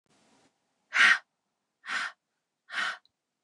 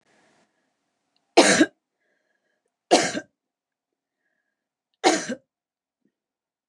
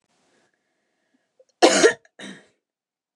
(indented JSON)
{
  "exhalation_length": "3.4 s",
  "exhalation_amplitude": 12058,
  "exhalation_signal_mean_std_ratio": 0.3,
  "three_cough_length": "6.7 s",
  "three_cough_amplitude": 29203,
  "three_cough_signal_mean_std_ratio": 0.24,
  "cough_length": "3.2 s",
  "cough_amplitude": 29043,
  "cough_signal_mean_std_ratio": 0.24,
  "survey_phase": "beta (2021-08-13 to 2022-03-07)",
  "age": "45-64",
  "gender": "Female",
  "wearing_mask": "No",
  "symptom_none": true,
  "smoker_status": "Ex-smoker",
  "respiratory_condition_asthma": false,
  "respiratory_condition_other": false,
  "recruitment_source": "REACT",
  "submission_delay": "2 days",
  "covid_test_result": "Negative",
  "covid_test_method": "RT-qPCR",
  "influenza_a_test_result": "Negative",
  "influenza_b_test_result": "Negative"
}